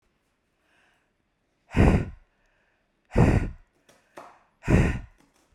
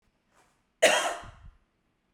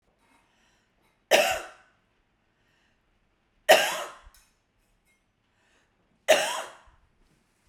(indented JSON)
{
  "exhalation_length": "5.5 s",
  "exhalation_amplitude": 16888,
  "exhalation_signal_mean_std_ratio": 0.33,
  "cough_length": "2.1 s",
  "cough_amplitude": 15157,
  "cough_signal_mean_std_ratio": 0.3,
  "three_cough_length": "7.7 s",
  "three_cough_amplitude": 28524,
  "three_cough_signal_mean_std_ratio": 0.25,
  "survey_phase": "beta (2021-08-13 to 2022-03-07)",
  "age": "45-64",
  "gender": "Female",
  "wearing_mask": "No",
  "symptom_none": true,
  "smoker_status": "Never smoked",
  "respiratory_condition_asthma": false,
  "respiratory_condition_other": false,
  "recruitment_source": "REACT",
  "submission_delay": "2 days",
  "covid_test_result": "Negative",
  "covid_test_method": "RT-qPCR"
}